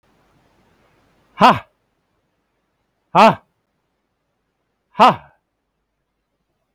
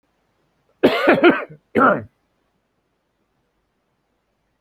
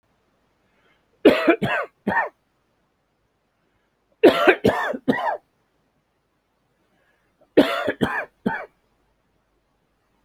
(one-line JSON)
{"exhalation_length": "6.7 s", "exhalation_amplitude": 32767, "exhalation_signal_mean_std_ratio": 0.21, "cough_length": "4.6 s", "cough_amplitude": 29035, "cough_signal_mean_std_ratio": 0.32, "three_cough_length": "10.2 s", "three_cough_amplitude": 29172, "three_cough_signal_mean_std_ratio": 0.32, "survey_phase": "alpha (2021-03-01 to 2021-08-12)", "age": "65+", "gender": "Male", "wearing_mask": "No", "symptom_none": true, "smoker_status": "Ex-smoker", "respiratory_condition_asthma": false, "respiratory_condition_other": false, "recruitment_source": "REACT", "submission_delay": "1 day", "covid_test_result": "Negative", "covid_test_method": "RT-qPCR"}